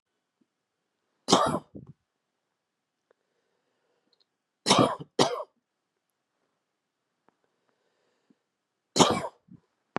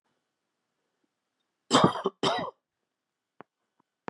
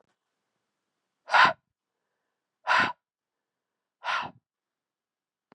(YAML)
three_cough_length: 10.0 s
three_cough_amplitude: 22680
three_cough_signal_mean_std_ratio: 0.24
cough_length: 4.1 s
cough_amplitude: 16000
cough_signal_mean_std_ratio: 0.26
exhalation_length: 5.5 s
exhalation_amplitude: 15886
exhalation_signal_mean_std_ratio: 0.25
survey_phase: beta (2021-08-13 to 2022-03-07)
age: 45-64
gender: Male
wearing_mask: 'No'
symptom_runny_or_blocked_nose: true
symptom_sore_throat: true
symptom_onset: 4 days
smoker_status: Never smoked
respiratory_condition_asthma: false
respiratory_condition_other: false
recruitment_source: Test and Trace
submission_delay: 1 day
covid_test_result: Positive
covid_test_method: ePCR